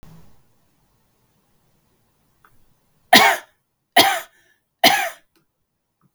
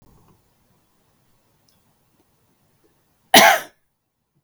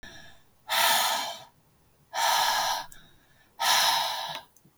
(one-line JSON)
{"three_cough_length": "6.1 s", "three_cough_amplitude": 32768, "three_cough_signal_mean_std_ratio": 0.26, "cough_length": "4.4 s", "cough_amplitude": 32768, "cough_signal_mean_std_ratio": 0.19, "exhalation_length": "4.8 s", "exhalation_amplitude": 9595, "exhalation_signal_mean_std_ratio": 0.6, "survey_phase": "beta (2021-08-13 to 2022-03-07)", "age": "18-44", "gender": "Female", "wearing_mask": "No", "symptom_headache": true, "symptom_onset": "3 days", "smoker_status": "Ex-smoker", "respiratory_condition_asthma": false, "respiratory_condition_other": false, "recruitment_source": "REACT", "submission_delay": "1 day", "covid_test_result": "Negative", "covid_test_method": "RT-qPCR", "influenza_a_test_result": "Negative", "influenza_b_test_result": "Negative"}